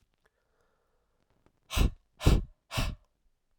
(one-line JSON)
{"exhalation_length": "3.6 s", "exhalation_amplitude": 11749, "exhalation_signal_mean_std_ratio": 0.29, "survey_phase": "alpha (2021-03-01 to 2021-08-12)", "age": "18-44", "gender": "Male", "wearing_mask": "No", "symptom_cough_any": true, "symptom_new_continuous_cough": true, "symptom_shortness_of_breath": true, "symptom_abdominal_pain": true, "symptom_diarrhoea": true, "symptom_fatigue": true, "symptom_onset": "3 days", "smoker_status": "Ex-smoker", "respiratory_condition_asthma": false, "respiratory_condition_other": false, "recruitment_source": "Test and Trace", "submission_delay": "2 days", "covid_test_result": "Positive", "covid_test_method": "RT-qPCR", "covid_ct_value": 21.9, "covid_ct_gene": "ORF1ab gene", "covid_ct_mean": 22.5, "covid_viral_load": "43000 copies/ml", "covid_viral_load_category": "Low viral load (10K-1M copies/ml)"}